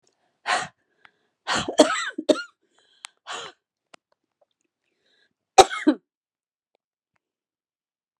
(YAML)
exhalation_length: 8.2 s
exhalation_amplitude: 32767
exhalation_signal_mean_std_ratio: 0.22
survey_phase: beta (2021-08-13 to 2022-03-07)
age: 65+
gender: Female
wearing_mask: 'No'
symptom_sore_throat: true
symptom_fatigue: true
symptom_headache: true
smoker_status: Ex-smoker
respiratory_condition_asthma: false
respiratory_condition_other: false
recruitment_source: REACT
submission_delay: 15 days
covid_test_result: Negative
covid_test_method: RT-qPCR